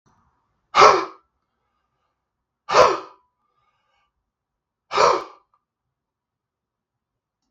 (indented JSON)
{
  "exhalation_length": "7.5 s",
  "exhalation_amplitude": 32768,
  "exhalation_signal_mean_std_ratio": 0.25,
  "survey_phase": "beta (2021-08-13 to 2022-03-07)",
  "age": "45-64",
  "gender": "Male",
  "wearing_mask": "No",
  "symptom_cough_any": true,
  "symptom_runny_or_blocked_nose": true,
  "symptom_fatigue": true,
  "symptom_other": true,
  "symptom_onset": "4 days",
  "smoker_status": "Ex-smoker",
  "respiratory_condition_asthma": false,
  "respiratory_condition_other": false,
  "recruitment_source": "Test and Trace",
  "submission_delay": "2 days",
  "covid_test_result": "Positive",
  "covid_test_method": "RT-qPCR",
  "covid_ct_value": 19.8,
  "covid_ct_gene": "ORF1ab gene",
  "covid_ct_mean": 20.2,
  "covid_viral_load": "230000 copies/ml",
  "covid_viral_load_category": "Low viral load (10K-1M copies/ml)"
}